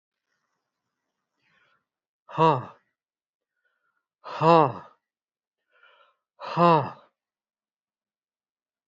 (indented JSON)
{
  "exhalation_length": "8.9 s",
  "exhalation_amplitude": 20288,
  "exhalation_signal_mean_std_ratio": 0.23,
  "survey_phase": "beta (2021-08-13 to 2022-03-07)",
  "age": "65+",
  "gender": "Male",
  "wearing_mask": "No",
  "symptom_none": true,
  "smoker_status": "Never smoked",
  "respiratory_condition_asthma": false,
  "respiratory_condition_other": false,
  "recruitment_source": "REACT",
  "submission_delay": "2 days",
  "covid_test_result": "Negative",
  "covid_test_method": "RT-qPCR"
}